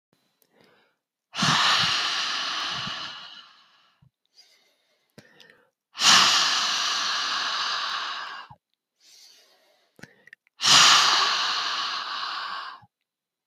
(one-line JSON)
{"exhalation_length": "13.5 s", "exhalation_amplitude": 25612, "exhalation_signal_mean_std_ratio": 0.51, "survey_phase": "beta (2021-08-13 to 2022-03-07)", "age": "45-64", "gender": "Female", "wearing_mask": "No", "symptom_cough_any": true, "symptom_fatigue": true, "symptom_fever_high_temperature": true, "symptom_headache": true, "smoker_status": "Ex-smoker", "respiratory_condition_asthma": false, "respiratory_condition_other": false, "recruitment_source": "Test and Trace", "submission_delay": "2 days", "covid_test_result": "Positive", "covid_test_method": "RT-qPCR"}